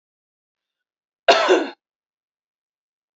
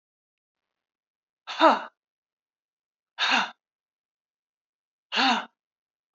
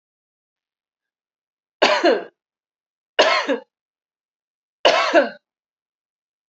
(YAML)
cough_length: 3.2 s
cough_amplitude: 27550
cough_signal_mean_std_ratio: 0.26
exhalation_length: 6.1 s
exhalation_amplitude: 20224
exhalation_signal_mean_std_ratio: 0.27
three_cough_length: 6.5 s
three_cough_amplitude: 32767
three_cough_signal_mean_std_ratio: 0.32
survey_phase: beta (2021-08-13 to 2022-03-07)
age: 45-64
gender: Female
wearing_mask: 'No'
symptom_cough_any: true
symptom_runny_or_blocked_nose: true
symptom_fatigue: true
symptom_headache: true
symptom_onset: 3 days
smoker_status: Never smoked
respiratory_condition_asthma: true
respiratory_condition_other: false
recruitment_source: Test and Trace
submission_delay: 1 day
covid_test_result: Positive
covid_test_method: RT-qPCR
covid_ct_value: 17.6
covid_ct_gene: N gene
covid_ct_mean: 18.3
covid_viral_load: 970000 copies/ml
covid_viral_load_category: Low viral load (10K-1M copies/ml)